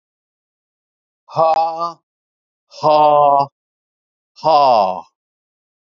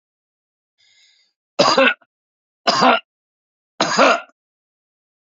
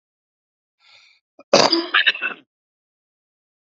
{"exhalation_length": "6.0 s", "exhalation_amplitude": 28832, "exhalation_signal_mean_std_ratio": 0.43, "three_cough_length": "5.4 s", "three_cough_amplitude": 32767, "three_cough_signal_mean_std_ratio": 0.34, "cough_length": "3.8 s", "cough_amplitude": 32767, "cough_signal_mean_std_ratio": 0.29, "survey_phase": "beta (2021-08-13 to 2022-03-07)", "age": "45-64", "gender": "Male", "wearing_mask": "No", "symptom_cough_any": true, "symptom_runny_or_blocked_nose": true, "symptom_shortness_of_breath": true, "symptom_change_to_sense_of_smell_or_taste": true, "smoker_status": "Current smoker (e-cigarettes or vapes only)", "respiratory_condition_asthma": false, "respiratory_condition_other": false, "recruitment_source": "Test and Trace", "submission_delay": "1 day", "covid_test_result": "Positive", "covid_test_method": "RT-qPCR"}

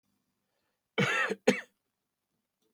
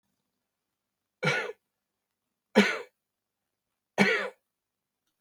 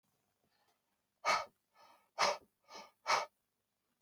{"cough_length": "2.7 s", "cough_amplitude": 11055, "cough_signal_mean_std_ratio": 0.31, "three_cough_length": "5.2 s", "three_cough_amplitude": 16783, "three_cough_signal_mean_std_ratio": 0.28, "exhalation_length": "4.0 s", "exhalation_amplitude": 4200, "exhalation_signal_mean_std_ratio": 0.3, "survey_phase": "beta (2021-08-13 to 2022-03-07)", "age": "45-64", "gender": "Male", "wearing_mask": "No", "symptom_none": true, "symptom_onset": "12 days", "smoker_status": "Never smoked", "respiratory_condition_asthma": false, "respiratory_condition_other": false, "recruitment_source": "REACT", "submission_delay": "1 day", "covid_test_result": "Negative", "covid_test_method": "RT-qPCR"}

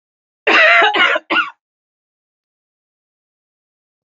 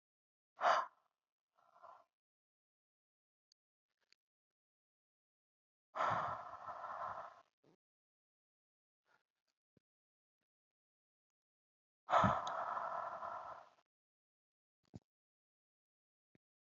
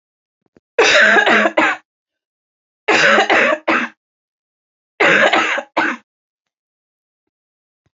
{"cough_length": "4.2 s", "cough_amplitude": 30877, "cough_signal_mean_std_ratio": 0.37, "exhalation_length": "16.7 s", "exhalation_amplitude": 3545, "exhalation_signal_mean_std_ratio": 0.27, "three_cough_length": "7.9 s", "three_cough_amplitude": 31591, "three_cough_signal_mean_std_ratio": 0.48, "survey_phase": "beta (2021-08-13 to 2022-03-07)", "age": "18-44", "gender": "Female", "wearing_mask": "No", "symptom_cough_any": true, "symptom_new_continuous_cough": true, "symptom_runny_or_blocked_nose": true, "symptom_diarrhoea": true, "symptom_fatigue": true, "symptom_change_to_sense_of_smell_or_taste": true, "symptom_loss_of_taste": true, "symptom_other": true, "symptom_onset": "2 days", "smoker_status": "Ex-smoker", "respiratory_condition_asthma": false, "respiratory_condition_other": false, "recruitment_source": "Test and Trace", "submission_delay": "2 days", "covid_test_result": "Positive", "covid_test_method": "ePCR"}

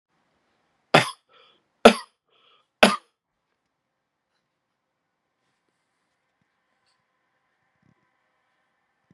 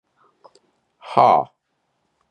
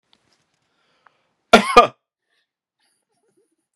{"three_cough_length": "9.1 s", "three_cough_amplitude": 32768, "three_cough_signal_mean_std_ratio": 0.13, "exhalation_length": "2.3 s", "exhalation_amplitude": 31394, "exhalation_signal_mean_std_ratio": 0.26, "cough_length": "3.8 s", "cough_amplitude": 32768, "cough_signal_mean_std_ratio": 0.18, "survey_phase": "beta (2021-08-13 to 2022-03-07)", "age": "45-64", "gender": "Male", "wearing_mask": "No", "symptom_none": true, "smoker_status": "Never smoked", "respiratory_condition_asthma": false, "respiratory_condition_other": false, "recruitment_source": "REACT", "submission_delay": "0 days", "covid_test_result": "Negative", "covid_test_method": "RT-qPCR", "influenza_a_test_result": "Negative", "influenza_b_test_result": "Negative"}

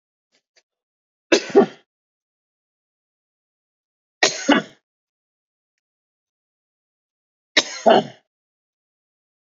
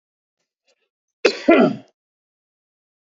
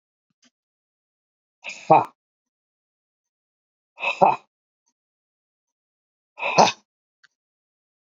{"three_cough_length": "9.5 s", "three_cough_amplitude": 29198, "three_cough_signal_mean_std_ratio": 0.21, "cough_length": "3.1 s", "cough_amplitude": 29207, "cough_signal_mean_std_ratio": 0.26, "exhalation_length": "8.1 s", "exhalation_amplitude": 28741, "exhalation_signal_mean_std_ratio": 0.21, "survey_phase": "beta (2021-08-13 to 2022-03-07)", "age": "45-64", "gender": "Male", "wearing_mask": "No", "symptom_cough_any": true, "symptom_runny_or_blocked_nose": true, "symptom_fatigue": true, "smoker_status": "Ex-smoker", "respiratory_condition_asthma": true, "respiratory_condition_other": false, "recruitment_source": "REACT", "submission_delay": "2 days", "covid_test_result": "Negative", "covid_test_method": "RT-qPCR", "influenza_a_test_result": "Negative", "influenza_b_test_result": "Negative"}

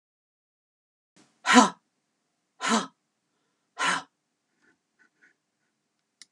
{"exhalation_length": "6.3 s", "exhalation_amplitude": 21396, "exhalation_signal_mean_std_ratio": 0.22, "survey_phase": "alpha (2021-03-01 to 2021-08-12)", "age": "65+", "gender": "Female", "wearing_mask": "No", "symptom_fatigue": true, "smoker_status": "Never smoked", "respiratory_condition_asthma": false, "respiratory_condition_other": false, "recruitment_source": "REACT", "submission_delay": "2 days", "covid_test_result": "Negative", "covid_test_method": "RT-qPCR"}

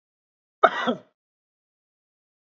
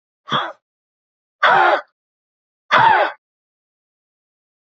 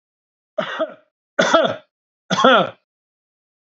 {"cough_length": "2.6 s", "cough_amplitude": 31204, "cough_signal_mean_std_ratio": 0.2, "exhalation_length": "4.7 s", "exhalation_amplitude": 28170, "exhalation_signal_mean_std_ratio": 0.36, "three_cough_length": "3.7 s", "three_cough_amplitude": 29411, "three_cough_signal_mean_std_ratio": 0.39, "survey_phase": "beta (2021-08-13 to 2022-03-07)", "age": "45-64", "gender": "Male", "wearing_mask": "No", "symptom_none": true, "smoker_status": "Never smoked", "respiratory_condition_asthma": false, "respiratory_condition_other": false, "recruitment_source": "REACT", "submission_delay": "2 days", "covid_test_result": "Negative", "covid_test_method": "RT-qPCR", "influenza_a_test_result": "Negative", "influenza_b_test_result": "Negative"}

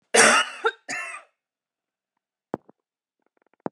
{"cough_length": "3.7 s", "cough_amplitude": 27483, "cough_signal_mean_std_ratio": 0.29, "survey_phase": "beta (2021-08-13 to 2022-03-07)", "age": "18-44", "gender": "Female", "wearing_mask": "No", "symptom_shortness_of_breath": true, "symptom_fatigue": true, "symptom_headache": true, "symptom_onset": "7 days", "smoker_status": "Current smoker (1 to 10 cigarettes per day)", "respiratory_condition_asthma": true, "respiratory_condition_other": false, "recruitment_source": "REACT", "submission_delay": "1 day", "covid_test_result": "Negative", "covid_test_method": "RT-qPCR", "influenza_a_test_result": "Negative", "influenza_b_test_result": "Negative"}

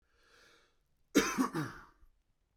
{"cough_length": "2.6 s", "cough_amplitude": 7391, "cough_signal_mean_std_ratio": 0.33, "survey_phase": "beta (2021-08-13 to 2022-03-07)", "age": "18-44", "gender": "Male", "wearing_mask": "No", "symptom_runny_or_blocked_nose": true, "symptom_onset": "8 days", "smoker_status": "Current smoker (11 or more cigarettes per day)", "respiratory_condition_asthma": true, "respiratory_condition_other": false, "recruitment_source": "REACT", "submission_delay": "0 days", "covid_test_result": "Negative", "covid_test_method": "RT-qPCR"}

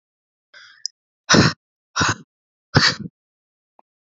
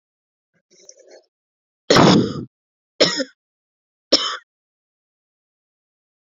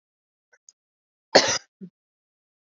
{"exhalation_length": "4.1 s", "exhalation_amplitude": 31043, "exhalation_signal_mean_std_ratio": 0.3, "three_cough_length": "6.2 s", "three_cough_amplitude": 32398, "three_cough_signal_mean_std_ratio": 0.28, "cough_length": "2.6 s", "cough_amplitude": 28285, "cough_signal_mean_std_ratio": 0.2, "survey_phase": "beta (2021-08-13 to 2022-03-07)", "age": "18-44", "gender": "Female", "wearing_mask": "No", "symptom_cough_any": true, "symptom_runny_or_blocked_nose": true, "symptom_sore_throat": true, "symptom_onset": "4 days", "smoker_status": "Current smoker (e-cigarettes or vapes only)", "respiratory_condition_asthma": false, "respiratory_condition_other": false, "recruitment_source": "Test and Trace", "submission_delay": "1 day", "covid_test_result": "Positive", "covid_test_method": "RT-qPCR", "covid_ct_value": 17.8, "covid_ct_gene": "ORF1ab gene", "covid_ct_mean": 18.2, "covid_viral_load": "1000000 copies/ml", "covid_viral_load_category": "High viral load (>1M copies/ml)"}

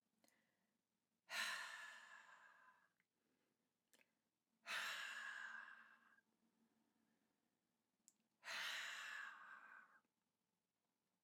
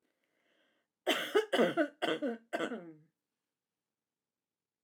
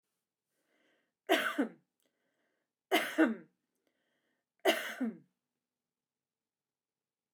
{"exhalation_length": "11.2 s", "exhalation_amplitude": 785, "exhalation_signal_mean_std_ratio": 0.45, "cough_length": "4.8 s", "cough_amplitude": 4785, "cough_signal_mean_std_ratio": 0.38, "three_cough_length": "7.3 s", "three_cough_amplitude": 6699, "three_cough_signal_mean_std_ratio": 0.29, "survey_phase": "beta (2021-08-13 to 2022-03-07)", "age": "45-64", "gender": "Female", "wearing_mask": "No", "symptom_runny_or_blocked_nose": true, "symptom_fatigue": true, "symptom_headache": true, "symptom_onset": "13 days", "smoker_status": "Ex-smoker", "respiratory_condition_asthma": false, "respiratory_condition_other": false, "recruitment_source": "REACT", "submission_delay": "2 days", "covid_test_result": "Negative", "covid_test_method": "RT-qPCR", "influenza_a_test_result": "Negative", "influenza_b_test_result": "Negative"}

